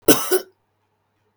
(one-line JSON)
{"cough_length": "1.4 s", "cough_amplitude": 32768, "cough_signal_mean_std_ratio": 0.32, "survey_phase": "beta (2021-08-13 to 2022-03-07)", "age": "18-44", "gender": "Female", "wearing_mask": "No", "symptom_none": true, "smoker_status": "Never smoked", "respiratory_condition_asthma": false, "respiratory_condition_other": false, "recruitment_source": "REACT", "submission_delay": "3 days", "covid_test_result": "Negative", "covid_test_method": "RT-qPCR", "influenza_a_test_result": "Negative", "influenza_b_test_result": "Negative"}